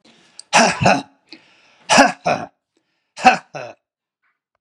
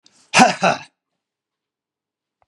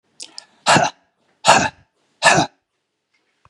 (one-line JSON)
{"three_cough_length": "4.6 s", "three_cough_amplitude": 32768, "three_cough_signal_mean_std_ratio": 0.35, "cough_length": "2.5 s", "cough_amplitude": 32767, "cough_signal_mean_std_ratio": 0.28, "exhalation_length": "3.5 s", "exhalation_amplitude": 32768, "exhalation_signal_mean_std_ratio": 0.35, "survey_phase": "beta (2021-08-13 to 2022-03-07)", "age": "45-64", "gender": "Male", "wearing_mask": "No", "symptom_none": true, "smoker_status": "Never smoked", "respiratory_condition_asthma": false, "respiratory_condition_other": false, "recruitment_source": "REACT", "submission_delay": "2 days", "covid_test_result": "Negative", "covid_test_method": "RT-qPCR", "influenza_a_test_result": "Negative", "influenza_b_test_result": "Negative"}